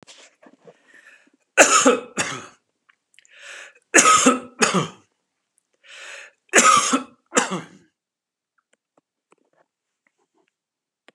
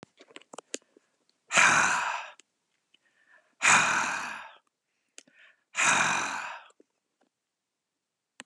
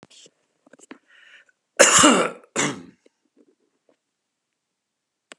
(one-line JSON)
{"three_cough_length": "11.1 s", "three_cough_amplitude": 32768, "three_cough_signal_mean_std_ratio": 0.32, "exhalation_length": "8.5 s", "exhalation_amplitude": 16044, "exhalation_signal_mean_std_ratio": 0.39, "cough_length": "5.4 s", "cough_amplitude": 32767, "cough_signal_mean_std_ratio": 0.27, "survey_phase": "beta (2021-08-13 to 2022-03-07)", "age": "65+", "gender": "Male", "wearing_mask": "No", "symptom_none": true, "smoker_status": "Ex-smoker", "respiratory_condition_asthma": false, "respiratory_condition_other": false, "recruitment_source": "REACT", "submission_delay": "3 days", "covid_test_result": "Negative", "covid_test_method": "RT-qPCR"}